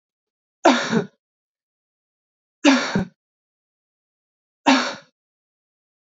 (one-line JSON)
{"three_cough_length": "6.1 s", "three_cough_amplitude": 25832, "three_cough_signal_mean_std_ratio": 0.3, "survey_phase": "beta (2021-08-13 to 2022-03-07)", "age": "18-44", "gender": "Female", "wearing_mask": "No", "symptom_cough_any": true, "symptom_runny_or_blocked_nose": true, "symptom_shortness_of_breath": true, "symptom_sore_throat": true, "symptom_headache": true, "symptom_onset": "2 days", "smoker_status": "Never smoked", "respiratory_condition_asthma": false, "respiratory_condition_other": false, "recruitment_source": "Test and Trace", "submission_delay": "1 day", "covid_test_result": "Positive", "covid_test_method": "RT-qPCR", "covid_ct_value": 28.7, "covid_ct_gene": "N gene", "covid_ct_mean": 28.9, "covid_viral_load": "340 copies/ml", "covid_viral_load_category": "Minimal viral load (< 10K copies/ml)"}